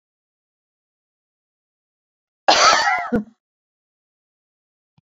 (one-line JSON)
{"cough_length": "5.0 s", "cough_amplitude": 31170, "cough_signal_mean_std_ratio": 0.28, "survey_phase": "beta (2021-08-13 to 2022-03-07)", "age": "45-64", "gender": "Female", "wearing_mask": "No", "symptom_none": true, "smoker_status": "Never smoked", "respiratory_condition_asthma": false, "respiratory_condition_other": false, "recruitment_source": "REACT", "submission_delay": "1 day", "covid_test_result": "Negative", "covid_test_method": "RT-qPCR"}